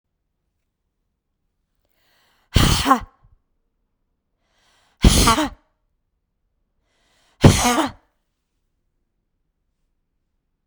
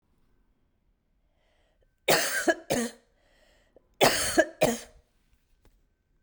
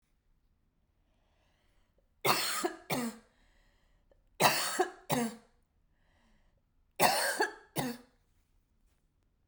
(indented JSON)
{
  "exhalation_length": "10.7 s",
  "exhalation_amplitude": 32768,
  "exhalation_signal_mean_std_ratio": 0.25,
  "cough_length": "6.2 s",
  "cough_amplitude": 17364,
  "cough_signal_mean_std_ratio": 0.33,
  "three_cough_length": "9.5 s",
  "three_cough_amplitude": 10063,
  "three_cough_signal_mean_std_ratio": 0.36,
  "survey_phase": "beta (2021-08-13 to 2022-03-07)",
  "age": "45-64",
  "gender": "Female",
  "wearing_mask": "No",
  "symptom_cough_any": true,
  "smoker_status": "Never smoked",
  "respiratory_condition_asthma": false,
  "respiratory_condition_other": false,
  "recruitment_source": "REACT",
  "submission_delay": "2 days",
  "covid_test_result": "Negative",
  "covid_test_method": "RT-qPCR"
}